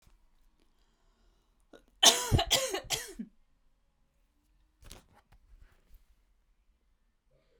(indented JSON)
{
  "three_cough_length": "7.6 s",
  "three_cough_amplitude": 17892,
  "three_cough_signal_mean_std_ratio": 0.24,
  "survey_phase": "beta (2021-08-13 to 2022-03-07)",
  "age": "18-44",
  "gender": "Female",
  "wearing_mask": "No",
  "symptom_cough_any": true,
  "symptom_sore_throat": true,
  "symptom_fatigue": true,
  "symptom_onset": "3 days",
  "smoker_status": "Never smoked",
  "respiratory_condition_asthma": false,
  "respiratory_condition_other": false,
  "recruitment_source": "Test and Trace",
  "submission_delay": "2 days",
  "covid_test_result": "Positive",
  "covid_test_method": "RT-qPCR"
}